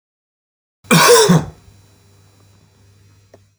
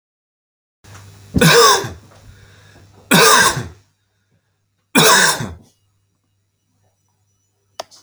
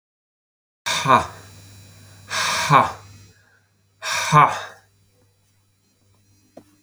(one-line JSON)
{"cough_length": "3.6 s", "cough_amplitude": 32768, "cough_signal_mean_std_ratio": 0.34, "three_cough_length": "8.0 s", "three_cough_amplitude": 32767, "three_cough_signal_mean_std_ratio": 0.36, "exhalation_length": "6.8 s", "exhalation_amplitude": 28596, "exhalation_signal_mean_std_ratio": 0.35, "survey_phase": "beta (2021-08-13 to 2022-03-07)", "age": "45-64", "gender": "Male", "wearing_mask": "No", "symptom_cough_any": true, "symptom_runny_or_blocked_nose": true, "symptom_onset": "4 days", "smoker_status": "Never smoked", "respiratory_condition_asthma": false, "respiratory_condition_other": false, "recruitment_source": "REACT", "submission_delay": "1 day", "covid_test_result": "Negative", "covid_test_method": "RT-qPCR"}